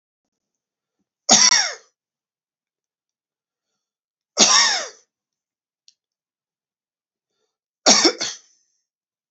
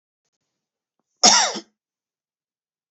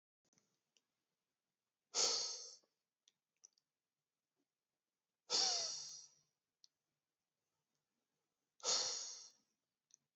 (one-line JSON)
{"three_cough_length": "9.3 s", "three_cough_amplitude": 32768, "three_cough_signal_mean_std_ratio": 0.27, "cough_length": "2.9 s", "cough_amplitude": 32768, "cough_signal_mean_std_ratio": 0.24, "exhalation_length": "10.2 s", "exhalation_amplitude": 2527, "exhalation_signal_mean_std_ratio": 0.3, "survey_phase": "beta (2021-08-13 to 2022-03-07)", "age": "45-64", "gender": "Male", "wearing_mask": "No", "symptom_sore_throat": true, "smoker_status": "Ex-smoker", "respiratory_condition_asthma": false, "respiratory_condition_other": false, "recruitment_source": "REACT", "submission_delay": "1 day", "covid_test_result": "Negative", "covid_test_method": "RT-qPCR"}